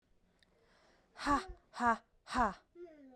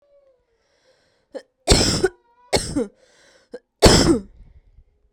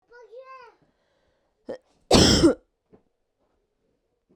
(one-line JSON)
{"exhalation_length": "3.2 s", "exhalation_amplitude": 4085, "exhalation_signal_mean_std_ratio": 0.37, "three_cough_length": "5.1 s", "three_cough_amplitude": 32768, "three_cough_signal_mean_std_ratio": 0.34, "cough_length": "4.4 s", "cough_amplitude": 27583, "cough_signal_mean_std_ratio": 0.27, "survey_phase": "beta (2021-08-13 to 2022-03-07)", "age": "18-44", "gender": "Female", "wearing_mask": "No", "symptom_none": true, "smoker_status": "Never smoked", "respiratory_condition_asthma": false, "respiratory_condition_other": false, "recruitment_source": "REACT", "submission_delay": "2 days", "covid_test_result": "Negative", "covid_test_method": "RT-qPCR"}